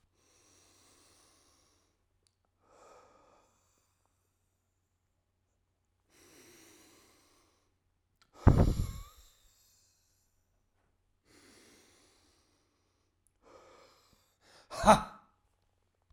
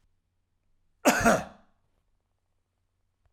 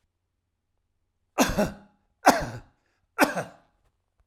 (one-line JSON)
{"exhalation_length": "16.1 s", "exhalation_amplitude": 16295, "exhalation_signal_mean_std_ratio": 0.16, "cough_length": "3.3 s", "cough_amplitude": 15656, "cough_signal_mean_std_ratio": 0.25, "three_cough_length": "4.3 s", "three_cough_amplitude": 28726, "three_cough_signal_mean_std_ratio": 0.29, "survey_phase": "beta (2021-08-13 to 2022-03-07)", "age": "45-64", "gender": "Male", "wearing_mask": "No", "symptom_runny_or_blocked_nose": true, "smoker_status": "Never smoked", "respiratory_condition_asthma": false, "respiratory_condition_other": false, "recruitment_source": "Test and Trace", "submission_delay": "1 day", "covid_test_result": "Positive", "covid_test_method": "RT-qPCR", "covid_ct_value": 15.4, "covid_ct_gene": "N gene"}